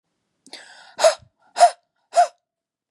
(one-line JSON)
{"exhalation_length": "2.9 s", "exhalation_amplitude": 28230, "exhalation_signal_mean_std_ratio": 0.28, "survey_phase": "beta (2021-08-13 to 2022-03-07)", "age": "45-64", "gender": "Female", "wearing_mask": "No", "symptom_fatigue": true, "smoker_status": "Never smoked", "respiratory_condition_asthma": false, "respiratory_condition_other": false, "recruitment_source": "REACT", "submission_delay": "1 day", "covid_test_result": "Negative", "covid_test_method": "RT-qPCR", "influenza_a_test_result": "Negative", "influenza_b_test_result": "Negative"}